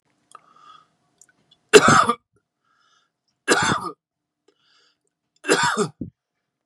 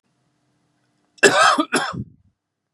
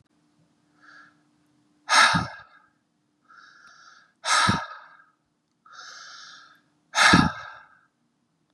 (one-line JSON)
{"three_cough_length": "6.7 s", "three_cough_amplitude": 32768, "three_cough_signal_mean_std_ratio": 0.3, "cough_length": "2.7 s", "cough_amplitude": 32767, "cough_signal_mean_std_ratio": 0.36, "exhalation_length": "8.5 s", "exhalation_amplitude": 27665, "exhalation_signal_mean_std_ratio": 0.3, "survey_phase": "beta (2021-08-13 to 2022-03-07)", "age": "18-44", "gender": "Male", "wearing_mask": "No", "symptom_runny_or_blocked_nose": true, "symptom_fatigue": true, "smoker_status": "Ex-smoker", "respiratory_condition_asthma": false, "respiratory_condition_other": false, "recruitment_source": "Test and Trace", "submission_delay": "2 days", "covid_test_result": "Positive", "covid_test_method": "RT-qPCR", "covid_ct_value": 28.8, "covid_ct_gene": "ORF1ab gene", "covid_ct_mean": 29.1, "covid_viral_load": "280 copies/ml", "covid_viral_load_category": "Minimal viral load (< 10K copies/ml)"}